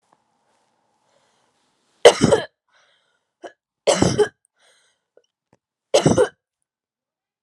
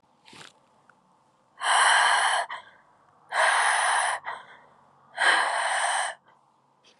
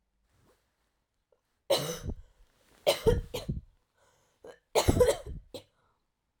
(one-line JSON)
{"three_cough_length": "7.4 s", "three_cough_amplitude": 32768, "three_cough_signal_mean_std_ratio": 0.26, "exhalation_length": "7.0 s", "exhalation_amplitude": 13441, "exhalation_signal_mean_std_ratio": 0.56, "cough_length": "6.4 s", "cough_amplitude": 11534, "cough_signal_mean_std_ratio": 0.33, "survey_phase": "alpha (2021-03-01 to 2021-08-12)", "age": "18-44", "gender": "Female", "wearing_mask": "No", "symptom_cough_any": true, "symptom_new_continuous_cough": true, "symptom_shortness_of_breath": true, "symptom_fatigue": true, "symptom_fever_high_temperature": true, "symptom_headache": true, "symptom_onset": "2 days", "smoker_status": "Never smoked", "respiratory_condition_asthma": false, "respiratory_condition_other": false, "recruitment_source": "Test and Trace", "submission_delay": "2 days", "covid_test_result": "Positive", "covid_test_method": "RT-qPCR"}